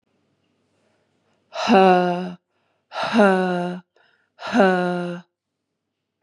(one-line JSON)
{"exhalation_length": "6.2 s", "exhalation_amplitude": 27782, "exhalation_signal_mean_std_ratio": 0.42, "survey_phase": "beta (2021-08-13 to 2022-03-07)", "age": "45-64", "gender": "Female", "wearing_mask": "No", "symptom_runny_or_blocked_nose": true, "symptom_sore_throat": true, "symptom_headache": true, "smoker_status": "Never smoked", "respiratory_condition_asthma": false, "respiratory_condition_other": false, "recruitment_source": "REACT", "submission_delay": "2 days", "covid_test_result": "Negative", "covid_test_method": "RT-qPCR", "influenza_a_test_result": "Negative", "influenza_b_test_result": "Negative"}